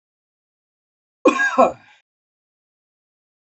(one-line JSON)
{"cough_length": "3.4 s", "cough_amplitude": 28311, "cough_signal_mean_std_ratio": 0.26, "survey_phase": "alpha (2021-03-01 to 2021-08-12)", "age": "45-64", "gender": "Male", "wearing_mask": "No", "symptom_cough_any": true, "smoker_status": "Never smoked", "respiratory_condition_asthma": true, "respiratory_condition_other": false, "recruitment_source": "Test and Trace", "submission_delay": "2 days", "covid_test_result": "Positive", "covid_test_method": "RT-qPCR"}